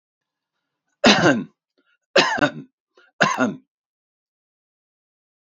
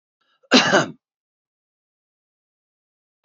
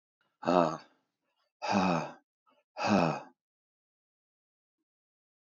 {"three_cough_length": "5.5 s", "three_cough_amplitude": 30939, "three_cough_signal_mean_std_ratio": 0.32, "cough_length": "3.2 s", "cough_amplitude": 29721, "cough_signal_mean_std_ratio": 0.24, "exhalation_length": "5.5 s", "exhalation_amplitude": 11669, "exhalation_signal_mean_std_ratio": 0.34, "survey_phase": "beta (2021-08-13 to 2022-03-07)", "age": "45-64", "gender": "Male", "wearing_mask": "No", "symptom_sore_throat": true, "smoker_status": "Ex-smoker", "respiratory_condition_asthma": false, "respiratory_condition_other": false, "recruitment_source": "REACT", "submission_delay": "1 day", "covid_test_result": "Negative", "covid_test_method": "RT-qPCR", "influenza_a_test_result": "Unknown/Void", "influenza_b_test_result": "Unknown/Void"}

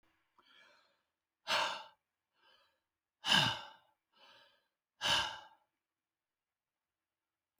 {"exhalation_length": "7.6 s", "exhalation_amplitude": 5562, "exhalation_signal_mean_std_ratio": 0.28, "survey_phase": "beta (2021-08-13 to 2022-03-07)", "age": "65+", "gender": "Male", "wearing_mask": "No", "symptom_none": true, "smoker_status": "Ex-smoker", "respiratory_condition_asthma": false, "respiratory_condition_other": false, "recruitment_source": "REACT", "submission_delay": "2 days", "covid_test_result": "Negative", "covid_test_method": "RT-qPCR"}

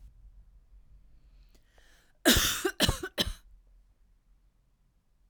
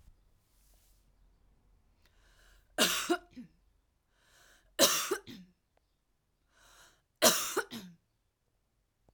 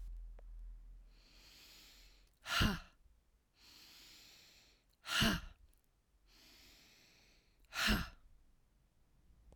{"cough_length": "5.3 s", "cough_amplitude": 12610, "cough_signal_mean_std_ratio": 0.31, "three_cough_length": "9.1 s", "three_cough_amplitude": 13222, "three_cough_signal_mean_std_ratio": 0.28, "exhalation_length": "9.6 s", "exhalation_amplitude": 3367, "exhalation_signal_mean_std_ratio": 0.35, "survey_phase": "alpha (2021-03-01 to 2021-08-12)", "age": "18-44", "gender": "Female", "wearing_mask": "No", "symptom_none": true, "smoker_status": "Current smoker (1 to 10 cigarettes per day)", "respiratory_condition_asthma": false, "respiratory_condition_other": false, "recruitment_source": "REACT", "submission_delay": "3 days", "covid_test_result": "Negative", "covid_test_method": "RT-qPCR"}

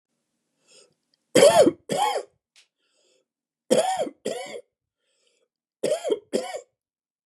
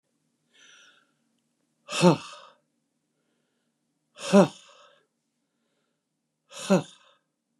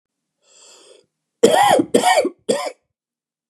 {"three_cough_length": "7.3 s", "three_cough_amplitude": 25958, "three_cough_signal_mean_std_ratio": 0.34, "exhalation_length": "7.6 s", "exhalation_amplitude": 16636, "exhalation_signal_mean_std_ratio": 0.21, "cough_length": "3.5 s", "cough_amplitude": 32768, "cough_signal_mean_std_ratio": 0.42, "survey_phase": "beta (2021-08-13 to 2022-03-07)", "age": "45-64", "gender": "Male", "wearing_mask": "No", "symptom_cough_any": true, "symptom_fatigue": true, "symptom_onset": "11 days", "smoker_status": "Never smoked", "respiratory_condition_asthma": true, "respiratory_condition_other": false, "recruitment_source": "REACT", "submission_delay": "3 days", "covid_test_result": "Positive", "covid_test_method": "RT-qPCR", "covid_ct_value": 21.0, "covid_ct_gene": "E gene", "influenza_a_test_result": "Negative", "influenza_b_test_result": "Negative"}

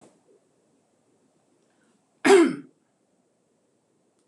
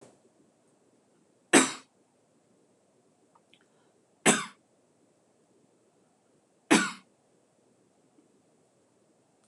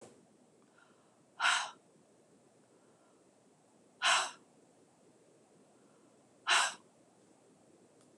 {"cough_length": "4.3 s", "cough_amplitude": 19845, "cough_signal_mean_std_ratio": 0.22, "three_cough_length": "9.5 s", "three_cough_amplitude": 16491, "three_cough_signal_mean_std_ratio": 0.18, "exhalation_length": "8.2 s", "exhalation_amplitude": 6345, "exhalation_signal_mean_std_ratio": 0.28, "survey_phase": "beta (2021-08-13 to 2022-03-07)", "age": "65+", "gender": "Female", "wearing_mask": "No", "symptom_none": true, "smoker_status": "Ex-smoker", "respiratory_condition_asthma": true, "respiratory_condition_other": false, "recruitment_source": "REACT", "submission_delay": "2 days", "covid_test_result": "Negative", "covid_test_method": "RT-qPCR", "influenza_a_test_result": "Negative", "influenza_b_test_result": "Negative"}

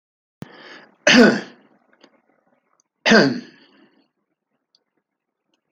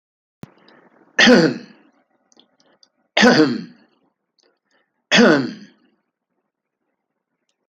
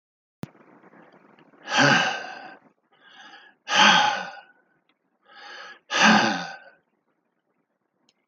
{"cough_length": "5.7 s", "cough_amplitude": 28598, "cough_signal_mean_std_ratio": 0.27, "three_cough_length": "7.7 s", "three_cough_amplitude": 29953, "three_cough_signal_mean_std_ratio": 0.31, "exhalation_length": "8.3 s", "exhalation_amplitude": 22542, "exhalation_signal_mean_std_ratio": 0.36, "survey_phase": "alpha (2021-03-01 to 2021-08-12)", "age": "65+", "gender": "Male", "wearing_mask": "No", "symptom_none": true, "symptom_onset": "13 days", "smoker_status": "Ex-smoker", "respiratory_condition_asthma": false, "respiratory_condition_other": false, "recruitment_source": "REACT", "submission_delay": "1 day", "covid_test_result": "Negative", "covid_test_method": "RT-qPCR"}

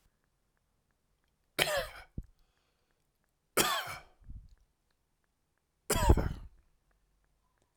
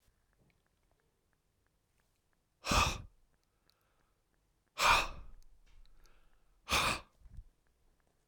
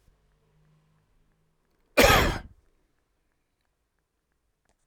{"three_cough_length": "7.8 s", "three_cough_amplitude": 15818, "three_cough_signal_mean_std_ratio": 0.28, "exhalation_length": "8.3 s", "exhalation_amplitude": 7332, "exhalation_signal_mean_std_ratio": 0.29, "cough_length": "4.9 s", "cough_amplitude": 19861, "cough_signal_mean_std_ratio": 0.22, "survey_phase": "alpha (2021-03-01 to 2021-08-12)", "age": "65+", "gender": "Male", "wearing_mask": "No", "symptom_none": true, "smoker_status": "Ex-smoker", "respiratory_condition_asthma": true, "respiratory_condition_other": false, "recruitment_source": "REACT", "submission_delay": "2 days", "covid_test_result": "Negative", "covid_test_method": "RT-qPCR"}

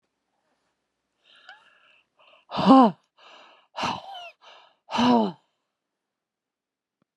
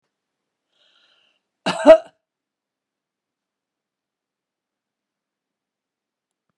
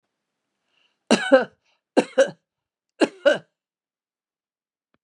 {"exhalation_length": "7.2 s", "exhalation_amplitude": 24382, "exhalation_signal_mean_std_ratio": 0.27, "cough_length": "6.6 s", "cough_amplitude": 32767, "cough_signal_mean_std_ratio": 0.13, "three_cough_length": "5.0 s", "three_cough_amplitude": 29188, "three_cough_signal_mean_std_ratio": 0.25, "survey_phase": "beta (2021-08-13 to 2022-03-07)", "age": "65+", "gender": "Female", "wearing_mask": "No", "symptom_runny_or_blocked_nose": true, "symptom_fatigue": true, "symptom_loss_of_taste": true, "smoker_status": "Ex-smoker", "respiratory_condition_asthma": false, "respiratory_condition_other": false, "recruitment_source": "REACT", "submission_delay": "3 days", "covid_test_result": "Negative", "covid_test_method": "RT-qPCR"}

